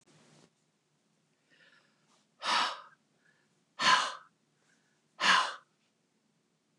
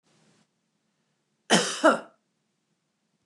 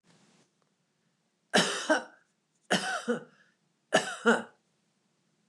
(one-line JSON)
{"exhalation_length": "6.8 s", "exhalation_amplitude": 10354, "exhalation_signal_mean_std_ratio": 0.29, "cough_length": "3.3 s", "cough_amplitude": 15533, "cough_signal_mean_std_ratio": 0.25, "three_cough_length": "5.5 s", "three_cough_amplitude": 10509, "three_cough_signal_mean_std_ratio": 0.34, "survey_phase": "beta (2021-08-13 to 2022-03-07)", "age": "65+", "gender": "Female", "wearing_mask": "No", "symptom_none": true, "smoker_status": "Never smoked", "respiratory_condition_asthma": false, "respiratory_condition_other": false, "recruitment_source": "REACT", "submission_delay": "2 days", "covid_test_result": "Negative", "covid_test_method": "RT-qPCR", "influenza_a_test_result": "Negative", "influenza_b_test_result": "Negative"}